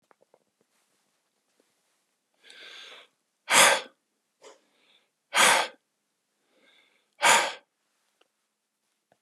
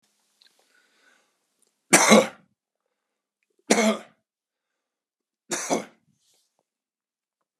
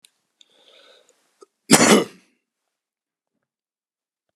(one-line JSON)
{"exhalation_length": "9.2 s", "exhalation_amplitude": 20492, "exhalation_signal_mean_std_ratio": 0.25, "three_cough_length": "7.6 s", "three_cough_amplitude": 31891, "three_cough_signal_mean_std_ratio": 0.23, "cough_length": "4.4 s", "cough_amplitude": 32768, "cough_signal_mean_std_ratio": 0.22, "survey_phase": "beta (2021-08-13 to 2022-03-07)", "age": "65+", "gender": "Male", "wearing_mask": "No", "symptom_none": true, "smoker_status": "Ex-smoker", "respiratory_condition_asthma": false, "respiratory_condition_other": false, "recruitment_source": "REACT", "submission_delay": "3 days", "covid_test_result": "Negative", "covid_test_method": "RT-qPCR"}